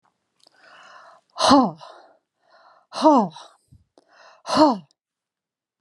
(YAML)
exhalation_length: 5.8 s
exhalation_amplitude: 26765
exhalation_signal_mean_std_ratio: 0.32
survey_phase: beta (2021-08-13 to 2022-03-07)
age: 45-64
gender: Female
wearing_mask: 'No'
symptom_none: true
smoker_status: Never smoked
respiratory_condition_asthma: false
respiratory_condition_other: false
recruitment_source: REACT
submission_delay: 1 day
covid_test_result: Negative
covid_test_method: RT-qPCR